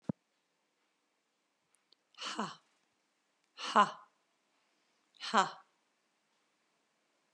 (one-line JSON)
{"exhalation_length": "7.3 s", "exhalation_amplitude": 8655, "exhalation_signal_mean_std_ratio": 0.2, "survey_phase": "alpha (2021-03-01 to 2021-08-12)", "age": "45-64", "gender": "Female", "wearing_mask": "No", "symptom_none": true, "smoker_status": "Never smoked", "respiratory_condition_asthma": false, "respiratory_condition_other": false, "recruitment_source": "REACT", "submission_delay": "3 days", "covid_test_result": "Negative", "covid_test_method": "RT-qPCR"}